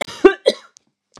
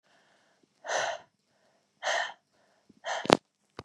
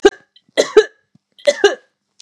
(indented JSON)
{
  "cough_length": "1.2 s",
  "cough_amplitude": 32768,
  "cough_signal_mean_std_ratio": 0.28,
  "exhalation_length": "3.8 s",
  "exhalation_amplitude": 32768,
  "exhalation_signal_mean_std_ratio": 0.27,
  "three_cough_length": "2.2 s",
  "three_cough_amplitude": 32768,
  "three_cough_signal_mean_std_ratio": 0.31,
  "survey_phase": "beta (2021-08-13 to 2022-03-07)",
  "age": "45-64",
  "gender": "Female",
  "wearing_mask": "No",
  "symptom_cough_any": true,
  "symptom_sore_throat": true,
  "symptom_headache": true,
  "smoker_status": "Never smoked",
  "respiratory_condition_asthma": false,
  "respiratory_condition_other": false,
  "recruitment_source": "Test and Trace",
  "submission_delay": "1 day",
  "covid_test_result": "Positive",
  "covid_test_method": "RT-qPCR",
  "covid_ct_value": 16.4,
  "covid_ct_gene": "ORF1ab gene",
  "covid_ct_mean": 16.7,
  "covid_viral_load": "3400000 copies/ml",
  "covid_viral_load_category": "High viral load (>1M copies/ml)"
}